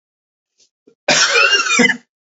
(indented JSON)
{
  "cough_length": "2.3 s",
  "cough_amplitude": 32767,
  "cough_signal_mean_std_ratio": 0.52,
  "survey_phase": "beta (2021-08-13 to 2022-03-07)",
  "age": "45-64",
  "gender": "Male",
  "wearing_mask": "No",
  "symptom_cough_any": true,
  "symptom_runny_or_blocked_nose": true,
  "symptom_sore_throat": true,
  "symptom_fatigue": true,
  "symptom_fever_high_temperature": true,
  "symptom_headache": true,
  "smoker_status": "Ex-smoker",
  "respiratory_condition_asthma": true,
  "respiratory_condition_other": false,
  "recruitment_source": "Test and Trace",
  "submission_delay": "1 day",
  "covid_test_result": "Positive",
  "covid_test_method": "LFT"
}